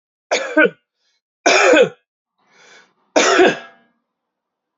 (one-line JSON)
{"three_cough_length": "4.8 s", "three_cough_amplitude": 28634, "three_cough_signal_mean_std_ratio": 0.4, "survey_phase": "alpha (2021-03-01 to 2021-08-12)", "age": "18-44", "gender": "Male", "wearing_mask": "No", "symptom_fatigue": true, "symptom_fever_high_temperature": true, "smoker_status": "Current smoker (1 to 10 cigarettes per day)", "respiratory_condition_asthma": false, "respiratory_condition_other": false, "recruitment_source": "Test and Trace", "submission_delay": "1 day", "covid_test_result": "Positive", "covid_test_method": "RT-qPCR", "covid_ct_value": 22.5, "covid_ct_gene": "ORF1ab gene"}